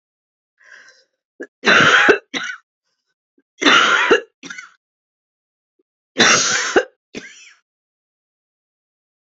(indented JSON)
{
  "three_cough_length": "9.3 s",
  "three_cough_amplitude": 31153,
  "three_cough_signal_mean_std_ratio": 0.36,
  "survey_phase": "beta (2021-08-13 to 2022-03-07)",
  "age": "65+",
  "gender": "Female",
  "wearing_mask": "No",
  "symptom_new_continuous_cough": true,
  "symptom_runny_or_blocked_nose": true,
  "symptom_shortness_of_breath": true,
  "symptom_headache": true,
  "symptom_onset": "3 days",
  "smoker_status": "Never smoked",
  "respiratory_condition_asthma": false,
  "respiratory_condition_other": false,
  "recruitment_source": "Test and Trace",
  "submission_delay": "1 day",
  "covid_test_result": "Positive",
  "covid_test_method": "RT-qPCR",
  "covid_ct_value": 19.9,
  "covid_ct_gene": "ORF1ab gene",
  "covid_ct_mean": 20.4,
  "covid_viral_load": "200000 copies/ml",
  "covid_viral_load_category": "Low viral load (10K-1M copies/ml)"
}